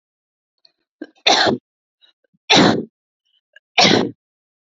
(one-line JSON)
{"three_cough_length": "4.6 s", "three_cough_amplitude": 30175, "three_cough_signal_mean_std_ratio": 0.36, "survey_phase": "beta (2021-08-13 to 2022-03-07)", "age": "18-44", "gender": "Female", "wearing_mask": "No", "symptom_none": true, "smoker_status": "Never smoked", "respiratory_condition_asthma": false, "respiratory_condition_other": false, "recruitment_source": "REACT", "submission_delay": "2 days", "covid_test_result": "Negative", "covid_test_method": "RT-qPCR", "influenza_a_test_result": "Negative", "influenza_b_test_result": "Negative"}